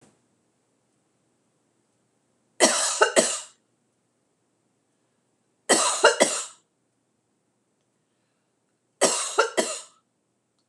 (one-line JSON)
{"three_cough_length": "10.7 s", "three_cough_amplitude": 26027, "three_cough_signal_mean_std_ratio": 0.31, "survey_phase": "beta (2021-08-13 to 2022-03-07)", "age": "45-64", "gender": "Female", "wearing_mask": "No", "symptom_none": true, "smoker_status": "Never smoked", "respiratory_condition_asthma": false, "respiratory_condition_other": false, "recruitment_source": "REACT", "submission_delay": "3 days", "covid_test_result": "Negative", "covid_test_method": "RT-qPCR", "influenza_a_test_result": "Negative", "influenza_b_test_result": "Negative"}